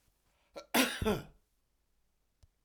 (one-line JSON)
{"cough_length": "2.6 s", "cough_amplitude": 6026, "cough_signal_mean_std_ratio": 0.32, "survey_phase": "alpha (2021-03-01 to 2021-08-12)", "age": "45-64", "gender": "Male", "wearing_mask": "No", "symptom_none": true, "smoker_status": "Ex-smoker", "respiratory_condition_asthma": false, "respiratory_condition_other": false, "recruitment_source": "REACT", "submission_delay": "1 day", "covid_test_result": "Negative", "covid_test_method": "RT-qPCR"}